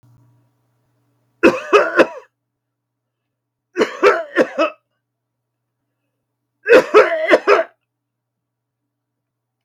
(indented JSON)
{
  "three_cough_length": "9.6 s",
  "three_cough_amplitude": 32768,
  "three_cough_signal_mean_std_ratio": 0.33,
  "survey_phase": "beta (2021-08-13 to 2022-03-07)",
  "age": "45-64",
  "gender": "Male",
  "wearing_mask": "No",
  "symptom_none": true,
  "smoker_status": "Never smoked",
  "respiratory_condition_asthma": false,
  "respiratory_condition_other": false,
  "recruitment_source": "REACT",
  "submission_delay": "1 day",
  "covid_test_result": "Negative",
  "covid_test_method": "RT-qPCR",
  "influenza_a_test_result": "Negative",
  "influenza_b_test_result": "Negative"
}